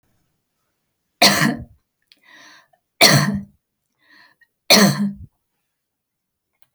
three_cough_length: 6.7 s
three_cough_amplitude: 32768
three_cough_signal_mean_std_ratio: 0.32
survey_phase: alpha (2021-03-01 to 2021-08-12)
age: 45-64
gender: Female
wearing_mask: 'No'
symptom_none: true
smoker_status: Ex-smoker
respiratory_condition_asthma: false
respiratory_condition_other: false
recruitment_source: REACT
submission_delay: 3 days
covid_test_result: Negative
covid_test_method: RT-qPCR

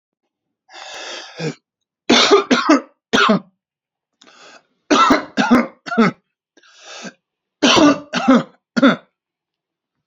three_cough_length: 10.1 s
three_cough_amplitude: 32767
three_cough_signal_mean_std_ratio: 0.43
survey_phase: alpha (2021-03-01 to 2021-08-12)
age: 45-64
gender: Male
wearing_mask: 'No'
symptom_none: true
smoker_status: Ex-smoker
respiratory_condition_asthma: false
respiratory_condition_other: false
recruitment_source: REACT
submission_delay: 1 day
covid_test_result: Negative
covid_test_method: RT-qPCR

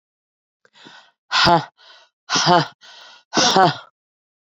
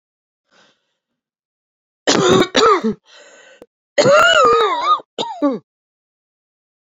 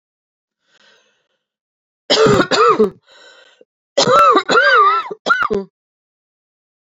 exhalation_length: 4.5 s
exhalation_amplitude: 31354
exhalation_signal_mean_std_ratio: 0.38
three_cough_length: 6.8 s
three_cough_amplitude: 29276
three_cough_signal_mean_std_ratio: 0.46
cough_length: 6.9 s
cough_amplitude: 30569
cough_signal_mean_std_ratio: 0.47
survey_phase: beta (2021-08-13 to 2022-03-07)
age: 45-64
gender: Female
wearing_mask: 'No'
symptom_cough_any: true
symptom_new_continuous_cough: true
symptom_runny_or_blocked_nose: true
symptom_shortness_of_breath: true
symptom_sore_throat: true
symptom_fatigue: true
symptom_headache: true
symptom_change_to_sense_of_smell_or_taste: true
symptom_loss_of_taste: true
symptom_onset: 3 days
smoker_status: Never smoked
respiratory_condition_asthma: false
respiratory_condition_other: false
recruitment_source: Test and Trace
submission_delay: 2 days
covid_test_result: Positive
covid_test_method: RT-qPCR
covid_ct_value: 16.0
covid_ct_gene: ORF1ab gene
covid_ct_mean: 16.5
covid_viral_load: 3900000 copies/ml
covid_viral_load_category: High viral load (>1M copies/ml)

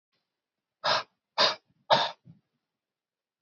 exhalation_length: 3.4 s
exhalation_amplitude: 13373
exhalation_signal_mean_std_ratio: 0.3
survey_phase: beta (2021-08-13 to 2022-03-07)
age: 18-44
gender: Male
wearing_mask: 'No'
symptom_none: true
smoker_status: Never smoked
respiratory_condition_asthma: false
respiratory_condition_other: false
recruitment_source: REACT
submission_delay: 2 days
covid_test_result: Negative
covid_test_method: RT-qPCR
influenza_a_test_result: Negative
influenza_b_test_result: Negative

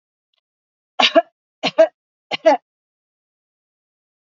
three_cough_length: 4.4 s
three_cough_amplitude: 27872
three_cough_signal_mean_std_ratio: 0.25
survey_phase: beta (2021-08-13 to 2022-03-07)
age: 45-64
gender: Female
wearing_mask: 'No'
symptom_sore_throat: true
symptom_fatigue: true
symptom_headache: true
symptom_change_to_sense_of_smell_or_taste: true
symptom_loss_of_taste: true
symptom_other: true
symptom_onset: 4 days
smoker_status: Ex-smoker
respiratory_condition_asthma: false
respiratory_condition_other: false
recruitment_source: Test and Trace
submission_delay: 1 day
covid_test_result: Positive
covid_test_method: RT-qPCR
covid_ct_value: 21.9
covid_ct_gene: ORF1ab gene
covid_ct_mean: 22.6
covid_viral_load: 40000 copies/ml
covid_viral_load_category: Low viral load (10K-1M copies/ml)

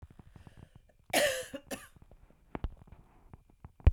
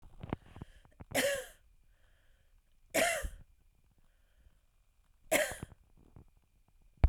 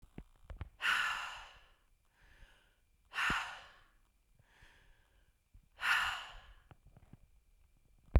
cough_length: 3.9 s
cough_amplitude: 10601
cough_signal_mean_std_ratio: 0.27
three_cough_length: 7.1 s
three_cough_amplitude: 6810
three_cough_signal_mean_std_ratio: 0.3
exhalation_length: 8.2 s
exhalation_amplitude: 6753
exhalation_signal_mean_std_ratio: 0.34
survey_phase: beta (2021-08-13 to 2022-03-07)
age: 45-64
gender: Female
wearing_mask: 'No'
symptom_cough_any: true
symptom_new_continuous_cough: true
symptom_runny_or_blocked_nose: true
symptom_sore_throat: true
symptom_onset: 4 days
smoker_status: Ex-smoker
respiratory_condition_asthma: false
respiratory_condition_other: false
recruitment_source: Test and Trace
submission_delay: 2 days
covid_test_result: Positive
covid_test_method: RT-qPCR
covid_ct_value: 20.6
covid_ct_gene: ORF1ab gene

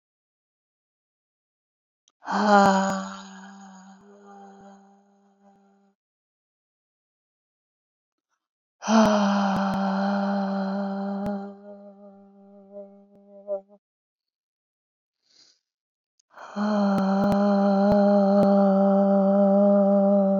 exhalation_length: 20.4 s
exhalation_amplitude: 20593
exhalation_signal_mean_std_ratio: 0.56
survey_phase: beta (2021-08-13 to 2022-03-07)
age: 65+
gender: Female
wearing_mask: 'No'
symptom_none: true
smoker_status: Never smoked
respiratory_condition_asthma: false
respiratory_condition_other: false
recruitment_source: REACT
submission_delay: 2 days
covid_test_result: Negative
covid_test_method: RT-qPCR
influenza_a_test_result: Negative
influenza_b_test_result: Negative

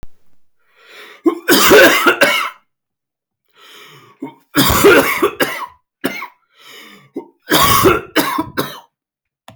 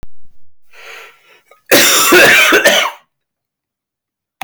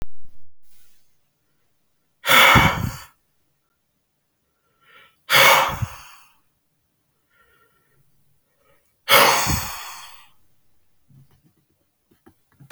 three_cough_length: 9.6 s
three_cough_amplitude: 32768
three_cough_signal_mean_std_ratio: 0.47
cough_length: 4.4 s
cough_amplitude: 32768
cough_signal_mean_std_ratio: 0.52
exhalation_length: 12.7 s
exhalation_amplitude: 32768
exhalation_signal_mean_std_ratio: 0.34
survey_phase: beta (2021-08-13 to 2022-03-07)
age: 18-44
gender: Male
wearing_mask: 'No'
symptom_fatigue: true
smoker_status: Never smoked
respiratory_condition_asthma: false
respiratory_condition_other: false
recruitment_source: REACT
submission_delay: 0 days
covid_test_result: Negative
covid_test_method: RT-qPCR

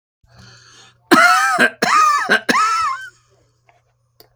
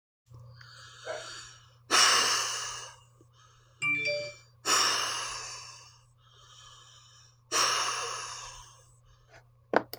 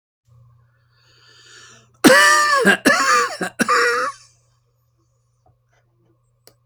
cough_length: 4.4 s
cough_amplitude: 31822
cough_signal_mean_std_ratio: 0.54
exhalation_length: 10.0 s
exhalation_amplitude: 14840
exhalation_signal_mean_std_ratio: 0.48
three_cough_length: 6.7 s
three_cough_amplitude: 31447
three_cough_signal_mean_std_ratio: 0.42
survey_phase: alpha (2021-03-01 to 2021-08-12)
age: 65+
gender: Female
wearing_mask: 'No'
symptom_none: true
smoker_status: Never smoked
respiratory_condition_asthma: false
respiratory_condition_other: false
recruitment_source: REACT
submission_delay: 2 days
covid_test_result: Negative
covid_test_method: RT-qPCR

